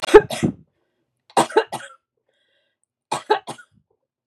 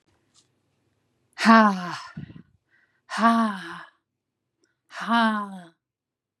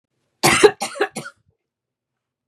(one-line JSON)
{"three_cough_length": "4.3 s", "three_cough_amplitude": 32768, "three_cough_signal_mean_std_ratio": 0.25, "exhalation_length": "6.4 s", "exhalation_amplitude": 28808, "exhalation_signal_mean_std_ratio": 0.35, "cough_length": "2.5 s", "cough_amplitude": 32767, "cough_signal_mean_std_ratio": 0.3, "survey_phase": "beta (2021-08-13 to 2022-03-07)", "age": "65+", "gender": "Female", "wearing_mask": "No", "symptom_runny_or_blocked_nose": true, "symptom_fatigue": true, "smoker_status": "Never smoked", "respiratory_condition_asthma": false, "respiratory_condition_other": false, "recruitment_source": "REACT", "submission_delay": "1 day", "covid_test_result": "Negative", "covid_test_method": "RT-qPCR", "influenza_a_test_result": "Negative", "influenza_b_test_result": "Negative"}